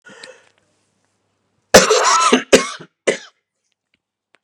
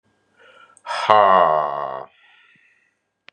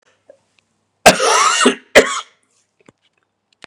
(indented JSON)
{
  "cough_length": "4.4 s",
  "cough_amplitude": 32768,
  "cough_signal_mean_std_ratio": 0.34,
  "exhalation_length": "3.3 s",
  "exhalation_amplitude": 32768,
  "exhalation_signal_mean_std_ratio": 0.38,
  "three_cough_length": "3.7 s",
  "three_cough_amplitude": 32768,
  "three_cough_signal_mean_std_ratio": 0.36,
  "survey_phase": "beta (2021-08-13 to 2022-03-07)",
  "age": "45-64",
  "gender": "Male",
  "wearing_mask": "No",
  "symptom_cough_any": true,
  "symptom_onset": "2 days",
  "smoker_status": "Never smoked",
  "respiratory_condition_asthma": false,
  "respiratory_condition_other": false,
  "recruitment_source": "Test and Trace",
  "submission_delay": "2 days",
  "covid_test_result": "Positive",
  "covid_test_method": "RT-qPCR",
  "covid_ct_value": 18.0,
  "covid_ct_gene": "N gene",
  "covid_ct_mean": 18.0,
  "covid_viral_load": "1200000 copies/ml",
  "covid_viral_load_category": "High viral load (>1M copies/ml)"
}